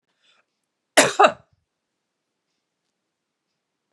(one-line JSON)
{"cough_length": "3.9 s", "cough_amplitude": 32068, "cough_signal_mean_std_ratio": 0.19, "survey_phase": "beta (2021-08-13 to 2022-03-07)", "age": "45-64", "gender": "Female", "wearing_mask": "No", "symptom_cough_any": true, "symptom_runny_or_blocked_nose": true, "symptom_sore_throat": true, "symptom_headache": true, "symptom_onset": "11 days", "smoker_status": "Never smoked", "respiratory_condition_asthma": false, "respiratory_condition_other": false, "recruitment_source": "Test and Trace", "submission_delay": "2 days", "covid_test_result": "Positive", "covid_test_method": "RT-qPCR", "covid_ct_value": 20.6, "covid_ct_gene": "N gene"}